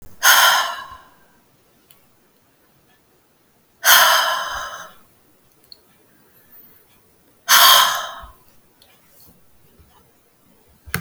{"exhalation_length": "11.0 s", "exhalation_amplitude": 32768, "exhalation_signal_mean_std_ratio": 0.33, "survey_phase": "alpha (2021-03-01 to 2021-08-12)", "age": "45-64", "gender": "Female", "wearing_mask": "No", "symptom_none": true, "smoker_status": "Never smoked", "respiratory_condition_asthma": false, "respiratory_condition_other": false, "recruitment_source": "REACT", "submission_delay": "2 days", "covid_test_result": "Negative", "covid_test_method": "RT-qPCR"}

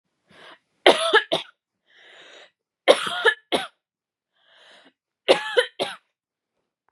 {"three_cough_length": "6.9 s", "three_cough_amplitude": 31741, "three_cough_signal_mean_std_ratio": 0.29, "survey_phase": "beta (2021-08-13 to 2022-03-07)", "age": "18-44", "gender": "Female", "wearing_mask": "No", "symptom_abdominal_pain": true, "symptom_fatigue": true, "symptom_headache": true, "symptom_onset": "7 days", "smoker_status": "Never smoked", "respiratory_condition_asthma": false, "respiratory_condition_other": false, "recruitment_source": "REACT", "submission_delay": "3 days", "covid_test_result": "Negative", "covid_test_method": "RT-qPCR"}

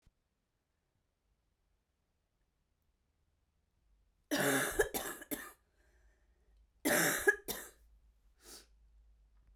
{"cough_length": "9.6 s", "cough_amplitude": 6032, "cough_signal_mean_std_ratio": 0.31, "survey_phase": "beta (2021-08-13 to 2022-03-07)", "age": "45-64", "gender": "Female", "wearing_mask": "No", "symptom_cough_any": true, "symptom_runny_or_blocked_nose": true, "symptom_shortness_of_breath": true, "symptom_abdominal_pain": true, "symptom_diarrhoea": true, "symptom_fatigue": true, "symptom_fever_high_temperature": true, "symptom_headache": true, "symptom_change_to_sense_of_smell_or_taste": true, "symptom_onset": "2 days", "smoker_status": "Ex-smoker", "respiratory_condition_asthma": false, "respiratory_condition_other": false, "recruitment_source": "Test and Trace", "submission_delay": "1 day", "covid_test_result": "Positive", "covid_test_method": "RT-qPCR"}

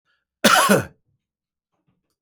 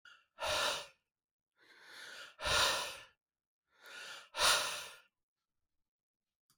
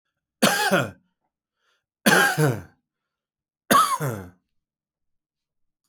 {"cough_length": "2.2 s", "cough_amplitude": 30218, "cough_signal_mean_std_ratio": 0.33, "exhalation_length": "6.6 s", "exhalation_amplitude": 5432, "exhalation_signal_mean_std_ratio": 0.4, "three_cough_length": "5.9 s", "three_cough_amplitude": 24940, "three_cough_signal_mean_std_ratio": 0.38, "survey_phase": "beta (2021-08-13 to 2022-03-07)", "age": "45-64", "gender": "Male", "wearing_mask": "No", "symptom_none": true, "smoker_status": "Never smoked", "respiratory_condition_asthma": false, "respiratory_condition_other": false, "recruitment_source": "REACT", "submission_delay": "14 days", "covid_test_result": "Negative", "covid_test_method": "RT-qPCR"}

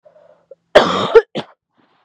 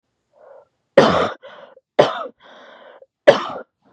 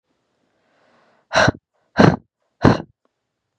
{"cough_length": "2.0 s", "cough_amplitude": 32768, "cough_signal_mean_std_ratio": 0.33, "three_cough_length": "3.9 s", "three_cough_amplitude": 32768, "three_cough_signal_mean_std_ratio": 0.31, "exhalation_length": "3.6 s", "exhalation_amplitude": 32768, "exhalation_signal_mean_std_ratio": 0.27, "survey_phase": "beta (2021-08-13 to 2022-03-07)", "age": "18-44", "gender": "Female", "wearing_mask": "No", "symptom_none": true, "smoker_status": "Never smoked", "respiratory_condition_asthma": false, "respiratory_condition_other": false, "recruitment_source": "REACT", "submission_delay": "6 days", "covid_test_result": "Negative", "covid_test_method": "RT-qPCR", "influenza_a_test_result": "Negative", "influenza_b_test_result": "Negative"}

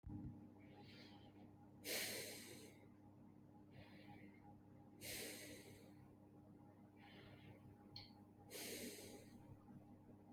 {"exhalation_length": "10.3 s", "exhalation_amplitude": 675, "exhalation_signal_mean_std_ratio": 0.77, "survey_phase": "beta (2021-08-13 to 2022-03-07)", "age": "45-64", "gender": "Female", "wearing_mask": "No", "symptom_cough_any": true, "symptom_runny_or_blocked_nose": true, "symptom_shortness_of_breath": true, "symptom_sore_throat": true, "symptom_fatigue": true, "symptom_onset": "12 days", "smoker_status": "Never smoked", "respiratory_condition_asthma": false, "respiratory_condition_other": false, "recruitment_source": "REACT", "submission_delay": "0 days", "covid_test_result": "Positive", "covid_test_method": "RT-qPCR", "covid_ct_value": 36.9, "covid_ct_gene": "N gene", "influenza_a_test_result": "Negative", "influenza_b_test_result": "Negative"}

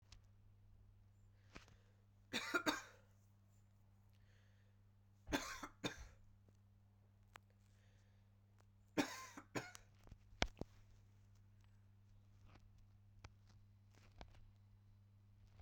{"three_cough_length": "15.6 s", "three_cough_amplitude": 4888, "three_cough_signal_mean_std_ratio": 0.34, "survey_phase": "beta (2021-08-13 to 2022-03-07)", "age": "18-44", "gender": "Female", "wearing_mask": "No", "symptom_cough_any": true, "symptom_new_continuous_cough": true, "symptom_runny_or_blocked_nose": true, "symptom_sore_throat": true, "symptom_fatigue": true, "symptom_change_to_sense_of_smell_or_taste": true, "symptom_onset": "3 days", "smoker_status": "Ex-smoker", "respiratory_condition_asthma": true, "respiratory_condition_other": false, "recruitment_source": "Test and Trace", "submission_delay": "2 days", "covid_test_result": "Positive", "covid_test_method": "RT-qPCR", "covid_ct_value": 20.9, "covid_ct_gene": "ORF1ab gene", "covid_ct_mean": 21.4, "covid_viral_load": "99000 copies/ml", "covid_viral_load_category": "Low viral load (10K-1M copies/ml)"}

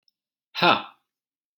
{"exhalation_length": "1.6 s", "exhalation_amplitude": 25525, "exhalation_signal_mean_std_ratio": 0.27, "survey_phase": "alpha (2021-03-01 to 2021-08-12)", "age": "18-44", "gender": "Male", "wearing_mask": "No", "symptom_none": true, "smoker_status": "Never smoked", "respiratory_condition_asthma": false, "respiratory_condition_other": false, "recruitment_source": "REACT", "submission_delay": "4 days", "covid_test_result": "Negative", "covid_test_method": "RT-qPCR"}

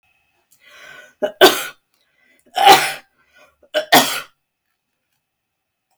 {"three_cough_length": "6.0 s", "three_cough_amplitude": 32768, "three_cough_signal_mean_std_ratio": 0.29, "survey_phase": "beta (2021-08-13 to 2022-03-07)", "age": "65+", "gender": "Female", "wearing_mask": "No", "symptom_none": true, "smoker_status": "Never smoked", "respiratory_condition_asthma": false, "respiratory_condition_other": false, "recruitment_source": "REACT", "submission_delay": "1 day", "covid_test_result": "Negative", "covid_test_method": "RT-qPCR", "influenza_a_test_result": "Negative", "influenza_b_test_result": "Negative"}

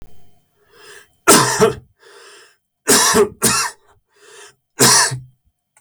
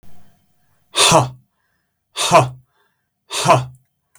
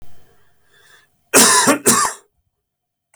{"three_cough_length": "5.8 s", "three_cough_amplitude": 32768, "three_cough_signal_mean_std_ratio": 0.44, "exhalation_length": "4.2 s", "exhalation_amplitude": 32768, "exhalation_signal_mean_std_ratio": 0.38, "cough_length": "3.2 s", "cough_amplitude": 32768, "cough_signal_mean_std_ratio": 0.42, "survey_phase": "beta (2021-08-13 to 2022-03-07)", "age": "45-64", "gender": "Male", "wearing_mask": "No", "symptom_none": true, "smoker_status": "Never smoked", "respiratory_condition_asthma": false, "respiratory_condition_other": false, "recruitment_source": "REACT", "submission_delay": "4 days", "covid_test_result": "Negative", "covid_test_method": "RT-qPCR"}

